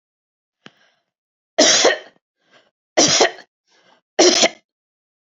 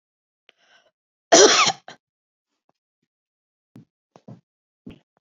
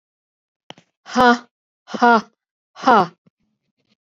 {"three_cough_length": "5.2 s", "three_cough_amplitude": 32768, "three_cough_signal_mean_std_ratio": 0.36, "cough_length": "5.2 s", "cough_amplitude": 32701, "cough_signal_mean_std_ratio": 0.22, "exhalation_length": "4.0 s", "exhalation_amplitude": 27699, "exhalation_signal_mean_std_ratio": 0.3, "survey_phase": "beta (2021-08-13 to 2022-03-07)", "age": "45-64", "gender": "Female", "wearing_mask": "No", "symptom_none": true, "smoker_status": "Never smoked", "respiratory_condition_asthma": false, "respiratory_condition_other": false, "recruitment_source": "REACT", "submission_delay": "2 days", "covid_test_result": "Negative", "covid_test_method": "RT-qPCR"}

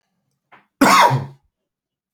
{"cough_length": "2.1 s", "cough_amplitude": 29389, "cough_signal_mean_std_ratio": 0.36, "survey_phase": "beta (2021-08-13 to 2022-03-07)", "age": "18-44", "gender": "Male", "wearing_mask": "No", "symptom_sore_throat": true, "symptom_onset": "2 days", "smoker_status": "Never smoked", "respiratory_condition_asthma": false, "respiratory_condition_other": false, "recruitment_source": "REACT", "submission_delay": "0 days", "covid_test_result": "Negative", "covid_test_method": "RT-qPCR"}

